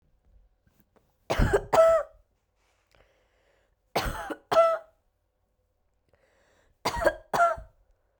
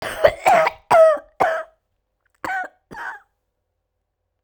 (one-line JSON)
{"three_cough_length": "8.2 s", "three_cough_amplitude": 13808, "three_cough_signal_mean_std_ratio": 0.35, "cough_length": "4.4 s", "cough_amplitude": 32767, "cough_signal_mean_std_ratio": 0.4, "survey_phase": "beta (2021-08-13 to 2022-03-07)", "age": "18-44", "gender": "Female", "wearing_mask": "No", "symptom_cough_any": true, "symptom_new_continuous_cough": true, "symptom_runny_or_blocked_nose": true, "symptom_shortness_of_breath": true, "symptom_sore_throat": true, "symptom_abdominal_pain": true, "symptom_fatigue": true, "symptom_fever_high_temperature": true, "symptom_headache": true, "smoker_status": "Never smoked", "respiratory_condition_asthma": false, "respiratory_condition_other": false, "recruitment_source": "Test and Trace", "submission_delay": "2 days", "covid_test_result": "Positive", "covid_test_method": "RT-qPCR", "covid_ct_value": 25.1, "covid_ct_gene": "ORF1ab gene", "covid_ct_mean": 26.1, "covid_viral_load": "2800 copies/ml", "covid_viral_load_category": "Minimal viral load (< 10K copies/ml)"}